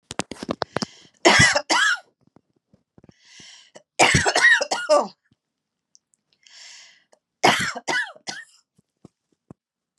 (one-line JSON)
{"three_cough_length": "10.0 s", "three_cough_amplitude": 28671, "three_cough_signal_mean_std_ratio": 0.37, "survey_phase": "beta (2021-08-13 to 2022-03-07)", "age": "45-64", "gender": "Female", "wearing_mask": "No", "symptom_cough_any": true, "symptom_runny_or_blocked_nose": true, "symptom_sore_throat": true, "symptom_fatigue": true, "symptom_headache": true, "smoker_status": "Never smoked", "respiratory_condition_asthma": false, "respiratory_condition_other": false, "recruitment_source": "Test and Trace", "submission_delay": "1 day", "covid_test_result": "Positive", "covid_test_method": "ePCR"}